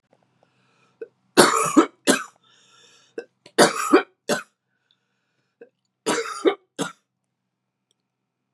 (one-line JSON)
{"three_cough_length": "8.5 s", "three_cough_amplitude": 32767, "three_cough_signal_mean_std_ratio": 0.3, "survey_phase": "beta (2021-08-13 to 2022-03-07)", "age": "18-44", "gender": "Female", "wearing_mask": "No", "symptom_cough_any": true, "symptom_runny_or_blocked_nose": true, "symptom_sore_throat": true, "symptom_fatigue": true, "symptom_fever_high_temperature": true, "symptom_headache": true, "symptom_other": true, "symptom_onset": "3 days", "smoker_status": "Ex-smoker", "respiratory_condition_asthma": false, "respiratory_condition_other": false, "recruitment_source": "Test and Trace", "submission_delay": "2 days", "covid_test_result": "Positive", "covid_test_method": "RT-qPCR", "covid_ct_value": 27.5, "covid_ct_gene": "ORF1ab gene", "covid_ct_mean": 27.8, "covid_viral_load": "740 copies/ml", "covid_viral_load_category": "Minimal viral load (< 10K copies/ml)"}